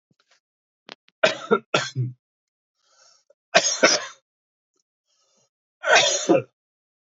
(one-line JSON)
{"three_cough_length": "7.2 s", "three_cough_amplitude": 29301, "three_cough_signal_mean_std_ratio": 0.33, "survey_phase": "beta (2021-08-13 to 2022-03-07)", "age": "18-44", "gender": "Male", "wearing_mask": "No", "symptom_cough_any": true, "symptom_runny_or_blocked_nose": true, "symptom_sore_throat": true, "symptom_fatigue": true, "symptom_fever_high_temperature": true, "symptom_headache": true, "smoker_status": "Never smoked", "respiratory_condition_asthma": false, "respiratory_condition_other": false, "recruitment_source": "Test and Trace", "submission_delay": "1 day", "covid_test_result": "Positive", "covid_test_method": "LFT"}